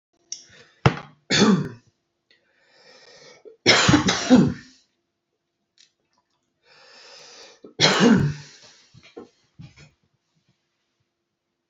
{"three_cough_length": "11.7 s", "three_cough_amplitude": 27293, "three_cough_signal_mean_std_ratio": 0.32, "survey_phase": "beta (2021-08-13 to 2022-03-07)", "age": "18-44", "gender": "Male", "wearing_mask": "No", "symptom_none": true, "smoker_status": "Never smoked", "respiratory_condition_asthma": false, "respiratory_condition_other": false, "recruitment_source": "REACT", "submission_delay": "1 day", "covid_test_result": "Negative", "covid_test_method": "RT-qPCR", "influenza_a_test_result": "Negative", "influenza_b_test_result": "Negative"}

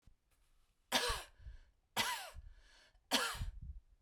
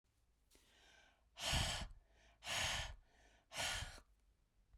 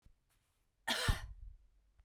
{"three_cough_length": "4.0 s", "three_cough_amplitude": 4432, "three_cough_signal_mean_std_ratio": 0.46, "exhalation_length": "4.8 s", "exhalation_amplitude": 1536, "exhalation_signal_mean_std_ratio": 0.48, "cough_length": "2.0 s", "cough_amplitude": 3443, "cough_signal_mean_std_ratio": 0.36, "survey_phase": "beta (2021-08-13 to 2022-03-07)", "age": "45-64", "gender": "Female", "wearing_mask": "No", "symptom_none": true, "smoker_status": "Never smoked", "respiratory_condition_asthma": false, "respiratory_condition_other": false, "recruitment_source": "REACT", "submission_delay": "2 days", "covid_test_result": "Negative", "covid_test_method": "RT-qPCR"}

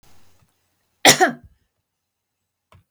{"three_cough_length": "2.9 s", "three_cough_amplitude": 32768, "three_cough_signal_mean_std_ratio": 0.22, "survey_phase": "beta (2021-08-13 to 2022-03-07)", "age": "65+", "gender": "Female", "wearing_mask": "No", "symptom_none": true, "smoker_status": "Ex-smoker", "respiratory_condition_asthma": false, "respiratory_condition_other": false, "recruitment_source": "REACT", "submission_delay": "1 day", "covid_test_result": "Negative", "covid_test_method": "RT-qPCR"}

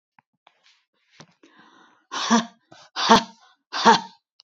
{"exhalation_length": "4.4 s", "exhalation_amplitude": 29224, "exhalation_signal_mean_std_ratio": 0.29, "survey_phase": "beta (2021-08-13 to 2022-03-07)", "age": "65+", "gender": "Female", "wearing_mask": "No", "symptom_none": true, "smoker_status": "Never smoked", "respiratory_condition_asthma": false, "respiratory_condition_other": false, "recruitment_source": "REACT", "submission_delay": "6 days", "covid_test_result": "Negative", "covid_test_method": "RT-qPCR"}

